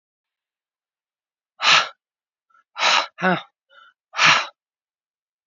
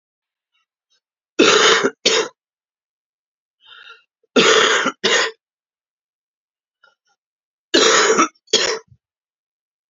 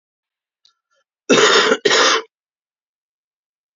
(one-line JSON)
{"exhalation_length": "5.5 s", "exhalation_amplitude": 28767, "exhalation_signal_mean_std_ratio": 0.32, "three_cough_length": "9.9 s", "three_cough_amplitude": 32768, "three_cough_signal_mean_std_ratio": 0.39, "cough_length": "3.8 s", "cough_amplitude": 29225, "cough_signal_mean_std_ratio": 0.39, "survey_phase": "alpha (2021-03-01 to 2021-08-12)", "age": "45-64", "gender": "Female", "wearing_mask": "No", "symptom_cough_any": true, "symptom_shortness_of_breath": true, "symptom_abdominal_pain": true, "symptom_fatigue": true, "symptom_headache": true, "symptom_onset": "3 days", "smoker_status": "Current smoker (11 or more cigarettes per day)", "respiratory_condition_asthma": false, "respiratory_condition_other": false, "recruitment_source": "Test and Trace", "submission_delay": "2 days", "covid_test_result": "Positive", "covid_test_method": "RT-qPCR", "covid_ct_value": 14.2, "covid_ct_gene": "S gene", "covid_ct_mean": 14.6, "covid_viral_load": "17000000 copies/ml", "covid_viral_load_category": "High viral load (>1M copies/ml)"}